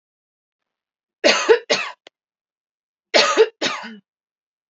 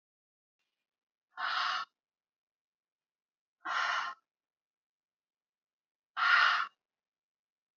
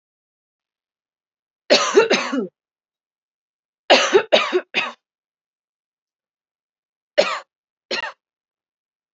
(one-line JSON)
{"cough_length": "4.7 s", "cough_amplitude": 28954, "cough_signal_mean_std_ratio": 0.34, "exhalation_length": "7.8 s", "exhalation_amplitude": 6600, "exhalation_signal_mean_std_ratio": 0.32, "three_cough_length": "9.1 s", "three_cough_amplitude": 30597, "three_cough_signal_mean_std_ratio": 0.31, "survey_phase": "beta (2021-08-13 to 2022-03-07)", "age": "18-44", "gender": "Female", "wearing_mask": "No", "symptom_none": true, "smoker_status": "Ex-smoker", "respiratory_condition_asthma": false, "respiratory_condition_other": false, "recruitment_source": "REACT", "submission_delay": "1 day", "covid_test_result": "Negative", "covid_test_method": "RT-qPCR", "influenza_a_test_result": "Negative", "influenza_b_test_result": "Negative"}